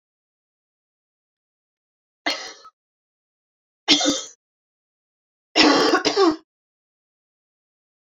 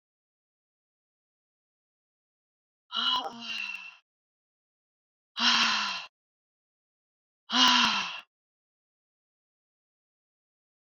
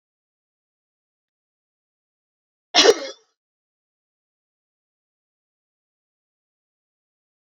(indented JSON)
{
  "three_cough_length": "8.0 s",
  "three_cough_amplitude": 30648,
  "three_cough_signal_mean_std_ratio": 0.3,
  "exhalation_length": "10.8 s",
  "exhalation_amplitude": 12669,
  "exhalation_signal_mean_std_ratio": 0.31,
  "cough_length": "7.4 s",
  "cough_amplitude": 30555,
  "cough_signal_mean_std_ratio": 0.13,
  "survey_phase": "beta (2021-08-13 to 2022-03-07)",
  "age": "45-64",
  "gender": "Female",
  "wearing_mask": "No",
  "symptom_none": true,
  "smoker_status": "Never smoked",
  "respiratory_condition_asthma": false,
  "respiratory_condition_other": false,
  "recruitment_source": "REACT",
  "submission_delay": "2 days",
  "covid_test_result": "Negative",
  "covid_test_method": "RT-qPCR"
}